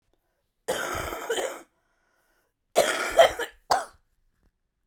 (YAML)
cough_length: 4.9 s
cough_amplitude: 19805
cough_signal_mean_std_ratio: 0.36
survey_phase: beta (2021-08-13 to 2022-03-07)
age: 45-64
gender: Female
wearing_mask: 'No'
symptom_cough_any: true
symptom_runny_or_blocked_nose: true
symptom_fatigue: true
symptom_change_to_sense_of_smell_or_taste: true
symptom_onset: 5 days
smoker_status: Current smoker (1 to 10 cigarettes per day)
respiratory_condition_asthma: false
respiratory_condition_other: true
recruitment_source: Test and Trace
submission_delay: 3 days
covid_test_result: Positive
covid_test_method: RT-qPCR